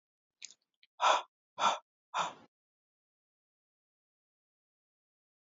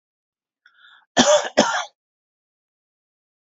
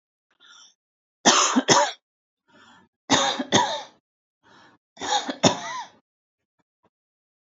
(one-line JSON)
{"exhalation_length": "5.5 s", "exhalation_amplitude": 6921, "exhalation_signal_mean_std_ratio": 0.24, "cough_length": "3.4 s", "cough_amplitude": 32768, "cough_signal_mean_std_ratio": 0.3, "three_cough_length": "7.6 s", "three_cough_amplitude": 31419, "three_cough_signal_mean_std_ratio": 0.36, "survey_phase": "alpha (2021-03-01 to 2021-08-12)", "age": "45-64", "gender": "Female", "wearing_mask": "No", "symptom_none": true, "smoker_status": "Never smoked", "respiratory_condition_asthma": false, "respiratory_condition_other": false, "recruitment_source": "REACT", "submission_delay": "2 days", "covid_test_result": "Negative", "covid_test_method": "RT-qPCR"}